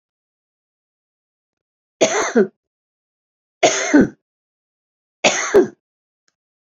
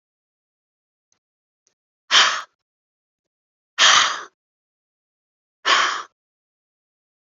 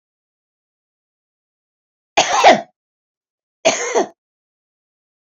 {
  "three_cough_length": "6.7 s",
  "three_cough_amplitude": 29561,
  "three_cough_signal_mean_std_ratio": 0.31,
  "exhalation_length": "7.3 s",
  "exhalation_amplitude": 30547,
  "exhalation_signal_mean_std_ratio": 0.28,
  "cough_length": "5.4 s",
  "cough_amplitude": 29578,
  "cough_signal_mean_std_ratio": 0.27,
  "survey_phase": "beta (2021-08-13 to 2022-03-07)",
  "age": "65+",
  "gender": "Female",
  "wearing_mask": "No",
  "symptom_none": true,
  "smoker_status": "Ex-smoker",
  "respiratory_condition_asthma": false,
  "respiratory_condition_other": false,
  "recruitment_source": "REACT",
  "submission_delay": "1 day",
  "covid_test_result": "Negative",
  "covid_test_method": "RT-qPCR"
}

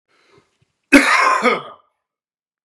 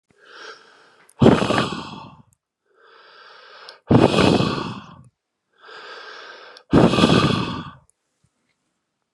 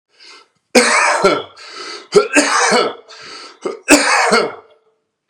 {
  "cough_length": "2.6 s",
  "cough_amplitude": 32768,
  "cough_signal_mean_std_ratio": 0.39,
  "exhalation_length": "9.1 s",
  "exhalation_amplitude": 32767,
  "exhalation_signal_mean_std_ratio": 0.39,
  "three_cough_length": "5.3 s",
  "three_cough_amplitude": 32768,
  "three_cough_signal_mean_std_ratio": 0.54,
  "survey_phase": "beta (2021-08-13 to 2022-03-07)",
  "age": "45-64",
  "gender": "Male",
  "wearing_mask": "No",
  "symptom_cough_any": true,
  "symptom_runny_or_blocked_nose": true,
  "symptom_sore_throat": true,
  "symptom_headache": true,
  "symptom_onset": "6 days",
  "smoker_status": "Ex-smoker",
  "respiratory_condition_asthma": false,
  "respiratory_condition_other": false,
  "recruitment_source": "Test and Trace",
  "submission_delay": "2 days",
  "covid_test_result": "Positive",
  "covid_test_method": "ePCR"
}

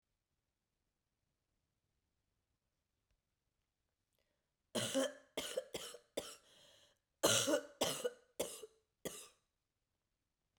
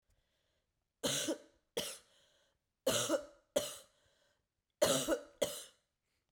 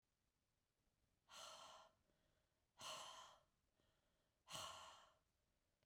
{
  "cough_length": "10.6 s",
  "cough_amplitude": 3598,
  "cough_signal_mean_std_ratio": 0.3,
  "three_cough_length": "6.3 s",
  "three_cough_amplitude": 5208,
  "three_cough_signal_mean_std_ratio": 0.39,
  "exhalation_length": "5.9 s",
  "exhalation_amplitude": 363,
  "exhalation_signal_mean_std_ratio": 0.45,
  "survey_phase": "beta (2021-08-13 to 2022-03-07)",
  "age": "45-64",
  "gender": "Female",
  "wearing_mask": "No",
  "symptom_new_continuous_cough": true,
  "symptom_runny_or_blocked_nose": true,
  "symptom_abdominal_pain": true,
  "symptom_fatigue": true,
  "symptom_fever_high_temperature": true,
  "symptom_headache": true,
  "symptom_onset": "3 days",
  "smoker_status": "Never smoked",
  "respiratory_condition_asthma": false,
  "respiratory_condition_other": false,
  "recruitment_source": "Test and Trace",
  "submission_delay": "2 days",
  "covid_test_result": "Positive",
  "covid_test_method": "RT-qPCR"
}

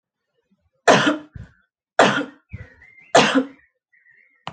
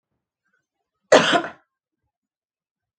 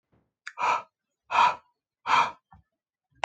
{
  "three_cough_length": "4.5 s",
  "three_cough_amplitude": 30407,
  "three_cough_signal_mean_std_ratio": 0.34,
  "cough_length": "3.0 s",
  "cough_amplitude": 29849,
  "cough_signal_mean_std_ratio": 0.23,
  "exhalation_length": "3.2 s",
  "exhalation_amplitude": 11814,
  "exhalation_signal_mean_std_ratio": 0.36,
  "survey_phase": "alpha (2021-03-01 to 2021-08-12)",
  "age": "18-44",
  "gender": "Female",
  "wearing_mask": "No",
  "symptom_none": true,
  "smoker_status": "Never smoked",
  "respiratory_condition_asthma": false,
  "respiratory_condition_other": false,
  "recruitment_source": "REACT",
  "submission_delay": "1 day",
  "covid_test_result": "Negative",
  "covid_test_method": "RT-qPCR"
}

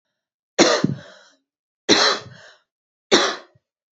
{
  "three_cough_length": "3.9 s",
  "three_cough_amplitude": 32307,
  "three_cough_signal_mean_std_ratio": 0.36,
  "survey_phase": "beta (2021-08-13 to 2022-03-07)",
  "age": "18-44",
  "gender": "Female",
  "wearing_mask": "No",
  "symptom_runny_or_blocked_nose": true,
  "symptom_sore_throat": true,
  "symptom_fatigue": true,
  "symptom_change_to_sense_of_smell_or_taste": true,
  "symptom_other": true,
  "smoker_status": "Never smoked",
  "respiratory_condition_asthma": false,
  "respiratory_condition_other": false,
  "recruitment_source": "Test and Trace",
  "submission_delay": "2 days",
  "covid_test_result": "Positive",
  "covid_test_method": "RT-qPCR",
  "covid_ct_value": 16.9,
  "covid_ct_gene": "ORF1ab gene",
  "covid_ct_mean": 17.5,
  "covid_viral_load": "1800000 copies/ml",
  "covid_viral_load_category": "High viral load (>1M copies/ml)"
}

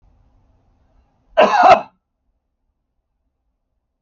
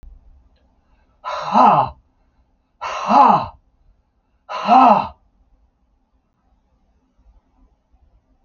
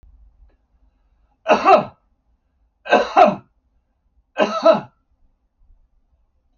{
  "cough_length": "4.0 s",
  "cough_amplitude": 28671,
  "cough_signal_mean_std_ratio": 0.26,
  "exhalation_length": "8.4 s",
  "exhalation_amplitude": 29237,
  "exhalation_signal_mean_std_ratio": 0.34,
  "three_cough_length": "6.6 s",
  "three_cough_amplitude": 32507,
  "three_cough_signal_mean_std_ratio": 0.31,
  "survey_phase": "alpha (2021-03-01 to 2021-08-12)",
  "age": "65+",
  "gender": "Male",
  "wearing_mask": "No",
  "symptom_none": true,
  "smoker_status": "Never smoked",
  "respiratory_condition_asthma": false,
  "respiratory_condition_other": false,
  "recruitment_source": "REACT",
  "submission_delay": "3 days",
  "covid_test_result": "Negative",
  "covid_test_method": "RT-qPCR"
}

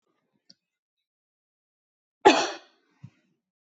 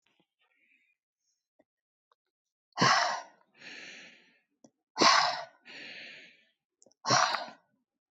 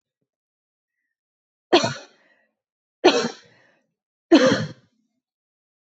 {
  "cough_length": "3.8 s",
  "cough_amplitude": 24105,
  "cough_signal_mean_std_ratio": 0.17,
  "exhalation_length": "8.1 s",
  "exhalation_amplitude": 10713,
  "exhalation_signal_mean_std_ratio": 0.31,
  "three_cough_length": "5.8 s",
  "three_cough_amplitude": 25364,
  "three_cough_signal_mean_std_ratio": 0.27,
  "survey_phase": "beta (2021-08-13 to 2022-03-07)",
  "age": "45-64",
  "gender": "Female",
  "wearing_mask": "No",
  "symptom_none": true,
  "smoker_status": "Ex-smoker",
  "respiratory_condition_asthma": false,
  "respiratory_condition_other": false,
  "recruitment_source": "REACT",
  "submission_delay": "1 day",
  "covid_test_result": "Negative",
  "covid_test_method": "RT-qPCR"
}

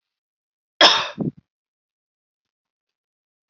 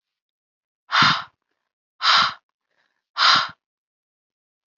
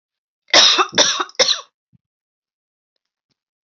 {
  "cough_length": "3.5 s",
  "cough_amplitude": 29577,
  "cough_signal_mean_std_ratio": 0.22,
  "exhalation_length": "4.8 s",
  "exhalation_amplitude": 24321,
  "exhalation_signal_mean_std_ratio": 0.34,
  "three_cough_length": "3.7 s",
  "three_cough_amplitude": 32768,
  "three_cough_signal_mean_std_ratio": 0.35,
  "survey_phase": "alpha (2021-03-01 to 2021-08-12)",
  "age": "18-44",
  "gender": "Female",
  "wearing_mask": "No",
  "symptom_fatigue": true,
  "symptom_fever_high_temperature": true,
  "symptom_headache": true,
  "smoker_status": "Never smoked",
  "respiratory_condition_asthma": false,
  "respiratory_condition_other": false,
  "recruitment_source": "Test and Trace",
  "submission_delay": "1 day",
  "covid_test_result": "Positive",
  "covid_test_method": "RT-qPCR"
}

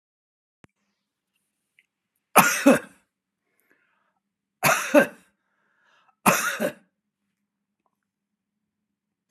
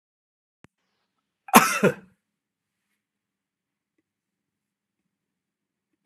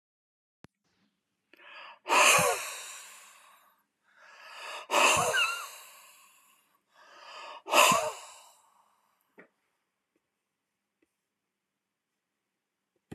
{
  "three_cough_length": "9.3 s",
  "three_cough_amplitude": 30883,
  "three_cough_signal_mean_std_ratio": 0.25,
  "cough_length": "6.1 s",
  "cough_amplitude": 32768,
  "cough_signal_mean_std_ratio": 0.16,
  "exhalation_length": "13.1 s",
  "exhalation_amplitude": 16919,
  "exhalation_signal_mean_std_ratio": 0.31,
  "survey_phase": "beta (2021-08-13 to 2022-03-07)",
  "age": "65+",
  "gender": "Male",
  "wearing_mask": "No",
  "symptom_none": true,
  "smoker_status": "Never smoked",
  "respiratory_condition_asthma": false,
  "respiratory_condition_other": false,
  "recruitment_source": "REACT",
  "submission_delay": "12 days",
  "covid_test_result": "Negative",
  "covid_test_method": "RT-qPCR"
}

